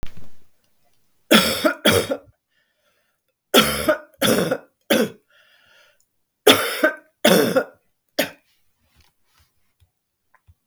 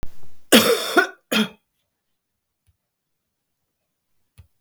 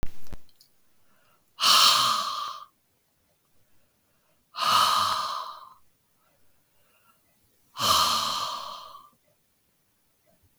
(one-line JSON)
{"three_cough_length": "10.7 s", "three_cough_amplitude": 32766, "three_cough_signal_mean_std_ratio": 0.39, "cough_length": "4.6 s", "cough_amplitude": 32766, "cough_signal_mean_std_ratio": 0.34, "exhalation_length": "10.6 s", "exhalation_amplitude": 18173, "exhalation_signal_mean_std_ratio": 0.44, "survey_phase": "beta (2021-08-13 to 2022-03-07)", "age": "65+", "gender": "Female", "wearing_mask": "No", "symptom_none": true, "smoker_status": "Never smoked", "respiratory_condition_asthma": false, "respiratory_condition_other": false, "recruitment_source": "REACT", "submission_delay": "1 day", "covid_test_result": "Negative", "covid_test_method": "RT-qPCR"}